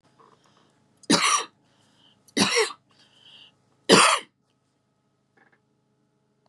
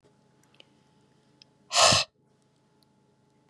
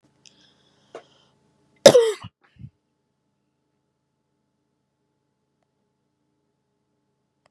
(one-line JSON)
{"three_cough_length": "6.5 s", "three_cough_amplitude": 27986, "three_cough_signal_mean_std_ratio": 0.29, "exhalation_length": "3.5 s", "exhalation_amplitude": 21462, "exhalation_signal_mean_std_ratio": 0.24, "cough_length": "7.5 s", "cough_amplitude": 32768, "cough_signal_mean_std_ratio": 0.14, "survey_phase": "beta (2021-08-13 to 2022-03-07)", "age": "45-64", "gender": "Female", "wearing_mask": "No", "symptom_cough_any": true, "symptom_sore_throat": true, "smoker_status": "Never smoked", "respiratory_condition_asthma": false, "respiratory_condition_other": false, "recruitment_source": "Test and Trace", "submission_delay": "2 days", "covid_test_result": "Negative", "covid_test_method": "RT-qPCR"}